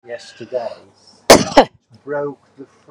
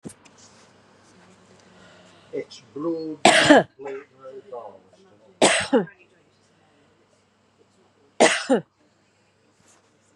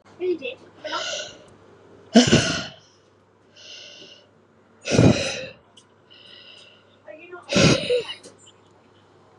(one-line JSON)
{"cough_length": "2.9 s", "cough_amplitude": 32768, "cough_signal_mean_std_ratio": 0.32, "three_cough_length": "10.2 s", "three_cough_amplitude": 32646, "three_cough_signal_mean_std_ratio": 0.3, "exhalation_length": "9.4 s", "exhalation_amplitude": 32737, "exhalation_signal_mean_std_ratio": 0.37, "survey_phase": "beta (2021-08-13 to 2022-03-07)", "age": "65+", "gender": "Female", "wearing_mask": "No", "symptom_none": true, "smoker_status": "Never smoked", "respiratory_condition_asthma": false, "respiratory_condition_other": false, "recruitment_source": "REACT", "submission_delay": "1 day", "covid_test_result": "Negative", "covid_test_method": "RT-qPCR"}